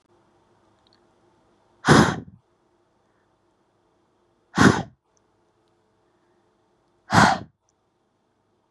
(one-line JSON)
{"exhalation_length": "8.7 s", "exhalation_amplitude": 27283, "exhalation_signal_mean_std_ratio": 0.23, "survey_phase": "beta (2021-08-13 to 2022-03-07)", "age": "18-44", "gender": "Female", "wearing_mask": "No", "symptom_none": true, "smoker_status": "Never smoked", "respiratory_condition_asthma": false, "respiratory_condition_other": false, "recruitment_source": "REACT", "submission_delay": "1 day", "covid_test_result": "Negative", "covid_test_method": "RT-qPCR", "influenza_a_test_result": "Negative", "influenza_b_test_result": "Negative"}